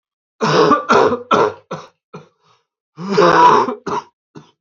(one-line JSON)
{"cough_length": "4.6 s", "cough_amplitude": 28976, "cough_signal_mean_std_ratio": 0.53, "survey_phase": "beta (2021-08-13 to 2022-03-07)", "age": "18-44", "gender": "Male", "wearing_mask": "No", "symptom_cough_any": true, "symptom_runny_or_blocked_nose": true, "symptom_diarrhoea": true, "symptom_other": true, "symptom_onset": "3 days", "smoker_status": "Never smoked", "respiratory_condition_asthma": false, "respiratory_condition_other": false, "recruitment_source": "Test and Trace", "submission_delay": "2 days", "covid_test_result": "Positive", "covid_test_method": "ePCR"}